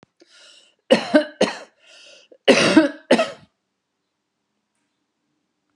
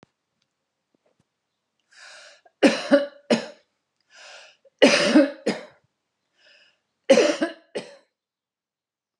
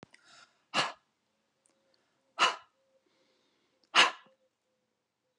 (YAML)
cough_length: 5.8 s
cough_amplitude: 31527
cough_signal_mean_std_ratio: 0.31
three_cough_length: 9.2 s
three_cough_amplitude: 27257
three_cough_signal_mean_std_ratio: 0.3
exhalation_length: 5.4 s
exhalation_amplitude: 11483
exhalation_signal_mean_std_ratio: 0.22
survey_phase: alpha (2021-03-01 to 2021-08-12)
age: 45-64
gender: Female
wearing_mask: 'No'
symptom_none: true
symptom_onset: 3 days
smoker_status: Never smoked
respiratory_condition_asthma: false
respiratory_condition_other: false
recruitment_source: REACT
submission_delay: 2 days
covid_test_result: Negative
covid_test_method: RT-qPCR